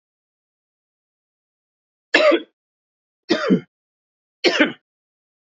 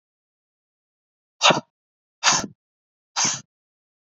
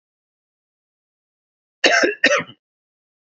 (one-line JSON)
{"three_cough_length": "5.5 s", "three_cough_amplitude": 29150, "three_cough_signal_mean_std_ratio": 0.29, "exhalation_length": "4.1 s", "exhalation_amplitude": 30457, "exhalation_signal_mean_std_ratio": 0.27, "cough_length": "3.2 s", "cough_amplitude": 28146, "cough_signal_mean_std_ratio": 0.3, "survey_phase": "beta (2021-08-13 to 2022-03-07)", "age": "18-44", "gender": "Male", "wearing_mask": "No", "symptom_sore_throat": true, "smoker_status": "Never smoked", "respiratory_condition_asthma": false, "respiratory_condition_other": false, "recruitment_source": "Test and Trace", "submission_delay": "2 days", "covid_test_result": "Positive", "covid_test_method": "LFT"}